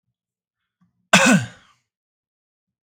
{"cough_length": "2.9 s", "cough_amplitude": 32768, "cough_signal_mean_std_ratio": 0.26, "survey_phase": "beta (2021-08-13 to 2022-03-07)", "age": "18-44", "gender": "Male", "wearing_mask": "No", "symptom_none": true, "symptom_onset": "12 days", "smoker_status": "Current smoker (1 to 10 cigarettes per day)", "respiratory_condition_asthma": false, "respiratory_condition_other": false, "recruitment_source": "REACT", "submission_delay": "1 day", "covid_test_result": "Negative", "covid_test_method": "RT-qPCR"}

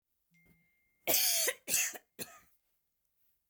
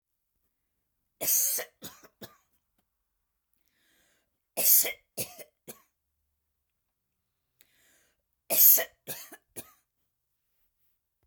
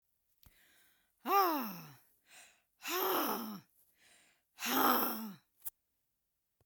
{"cough_length": "3.5 s", "cough_amplitude": 5735, "cough_signal_mean_std_ratio": 0.38, "three_cough_length": "11.3 s", "three_cough_amplitude": 18027, "three_cough_signal_mean_std_ratio": 0.24, "exhalation_length": "6.7 s", "exhalation_amplitude": 5176, "exhalation_signal_mean_std_ratio": 0.44, "survey_phase": "beta (2021-08-13 to 2022-03-07)", "age": "65+", "gender": "Female", "wearing_mask": "No", "symptom_runny_or_blocked_nose": true, "symptom_onset": "13 days", "smoker_status": "Ex-smoker", "respiratory_condition_asthma": false, "respiratory_condition_other": false, "recruitment_source": "REACT", "submission_delay": "1 day", "covid_test_result": "Negative", "covid_test_method": "RT-qPCR", "influenza_a_test_result": "Negative", "influenza_b_test_result": "Negative"}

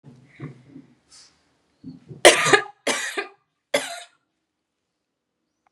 {"three_cough_length": "5.7 s", "three_cough_amplitude": 32768, "three_cough_signal_mean_std_ratio": 0.26, "survey_phase": "beta (2021-08-13 to 2022-03-07)", "age": "45-64", "gender": "Female", "wearing_mask": "Yes", "symptom_sore_throat": true, "symptom_fatigue": true, "symptom_onset": "3 days", "smoker_status": "Never smoked", "respiratory_condition_asthma": false, "respiratory_condition_other": false, "recruitment_source": "Test and Trace", "submission_delay": "1 day", "covid_test_result": "Positive", "covid_test_method": "RT-qPCR", "covid_ct_value": 22.7, "covid_ct_gene": "N gene"}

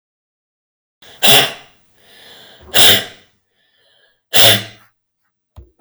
{"exhalation_length": "5.8 s", "exhalation_amplitude": 32768, "exhalation_signal_mean_std_ratio": 0.32, "survey_phase": "beta (2021-08-13 to 2022-03-07)", "age": "18-44", "gender": "Female", "wearing_mask": "No", "symptom_fatigue": true, "smoker_status": "Ex-smoker", "respiratory_condition_asthma": false, "respiratory_condition_other": false, "recruitment_source": "REACT", "submission_delay": "0 days", "covid_test_result": "Negative", "covid_test_method": "RT-qPCR"}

